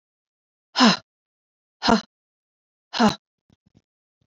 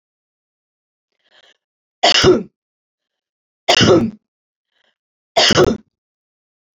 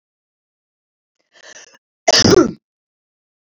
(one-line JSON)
{"exhalation_length": "4.3 s", "exhalation_amplitude": 24396, "exhalation_signal_mean_std_ratio": 0.26, "three_cough_length": "6.7 s", "three_cough_amplitude": 31300, "three_cough_signal_mean_std_ratio": 0.33, "cough_length": "3.5 s", "cough_amplitude": 32768, "cough_signal_mean_std_ratio": 0.27, "survey_phase": "beta (2021-08-13 to 2022-03-07)", "age": "45-64", "gender": "Female", "wearing_mask": "No", "symptom_none": true, "smoker_status": "Never smoked", "respiratory_condition_asthma": false, "respiratory_condition_other": false, "recruitment_source": "Test and Trace", "submission_delay": "1 day", "covid_test_result": "Negative", "covid_test_method": "RT-qPCR"}